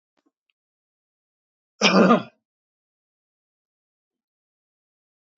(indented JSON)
{
  "cough_length": "5.4 s",
  "cough_amplitude": 24393,
  "cough_signal_mean_std_ratio": 0.21,
  "survey_phase": "beta (2021-08-13 to 2022-03-07)",
  "age": "65+",
  "gender": "Male",
  "wearing_mask": "No",
  "symptom_none": true,
  "smoker_status": "Never smoked",
  "respiratory_condition_asthma": false,
  "respiratory_condition_other": false,
  "recruitment_source": "REACT",
  "submission_delay": "3 days",
  "covid_test_result": "Negative",
  "covid_test_method": "RT-qPCR",
  "influenza_a_test_result": "Negative",
  "influenza_b_test_result": "Negative"
}